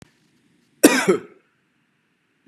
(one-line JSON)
{"cough_length": "2.5 s", "cough_amplitude": 32768, "cough_signal_mean_std_ratio": 0.26, "survey_phase": "beta (2021-08-13 to 2022-03-07)", "age": "18-44", "gender": "Male", "wearing_mask": "No", "symptom_none": true, "symptom_onset": "12 days", "smoker_status": "Never smoked", "respiratory_condition_asthma": false, "respiratory_condition_other": false, "recruitment_source": "REACT", "submission_delay": "1 day", "covid_test_result": "Negative", "covid_test_method": "RT-qPCR", "influenza_a_test_result": "Negative", "influenza_b_test_result": "Negative"}